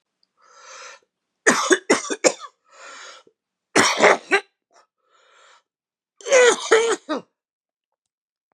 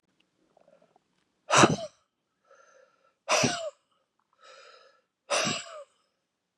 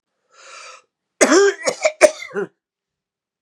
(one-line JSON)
{"three_cough_length": "8.5 s", "three_cough_amplitude": 32471, "three_cough_signal_mean_std_ratio": 0.35, "exhalation_length": "6.6 s", "exhalation_amplitude": 19554, "exhalation_signal_mean_std_ratio": 0.28, "cough_length": "3.4 s", "cough_amplitude": 32768, "cough_signal_mean_std_ratio": 0.36, "survey_phase": "beta (2021-08-13 to 2022-03-07)", "age": "45-64", "gender": "Male", "wearing_mask": "No", "symptom_cough_any": true, "symptom_runny_or_blocked_nose": true, "symptom_sore_throat": true, "symptom_headache": true, "symptom_onset": "2 days", "smoker_status": "Ex-smoker", "respiratory_condition_asthma": false, "respiratory_condition_other": false, "recruitment_source": "Test and Trace", "submission_delay": "0 days", "covid_test_result": "Positive", "covid_test_method": "LAMP"}